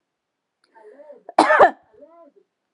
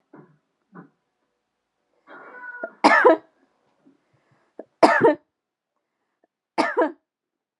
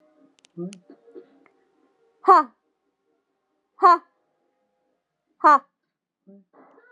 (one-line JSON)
{"cough_length": "2.7 s", "cough_amplitude": 32767, "cough_signal_mean_std_ratio": 0.27, "three_cough_length": "7.6 s", "three_cough_amplitude": 31932, "three_cough_signal_mean_std_ratio": 0.27, "exhalation_length": "6.9 s", "exhalation_amplitude": 26852, "exhalation_signal_mean_std_ratio": 0.22, "survey_phase": "beta (2021-08-13 to 2022-03-07)", "age": "45-64", "gender": "Female", "wearing_mask": "No", "symptom_none": true, "smoker_status": "Never smoked", "respiratory_condition_asthma": true, "respiratory_condition_other": false, "recruitment_source": "REACT", "submission_delay": "1 day", "covid_test_result": "Negative", "covid_test_method": "RT-qPCR"}